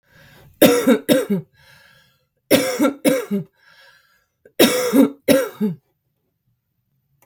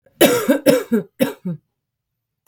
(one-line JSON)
{"three_cough_length": "7.3 s", "three_cough_amplitude": 32768, "three_cough_signal_mean_std_ratio": 0.43, "cough_length": "2.5 s", "cough_amplitude": 32768, "cough_signal_mean_std_ratio": 0.45, "survey_phase": "beta (2021-08-13 to 2022-03-07)", "age": "18-44", "gender": "Female", "wearing_mask": "No", "symptom_none": true, "smoker_status": "Current smoker (11 or more cigarettes per day)", "respiratory_condition_asthma": false, "respiratory_condition_other": false, "recruitment_source": "REACT", "submission_delay": "5 days", "covid_test_result": "Negative", "covid_test_method": "RT-qPCR", "influenza_a_test_result": "Negative", "influenza_b_test_result": "Negative"}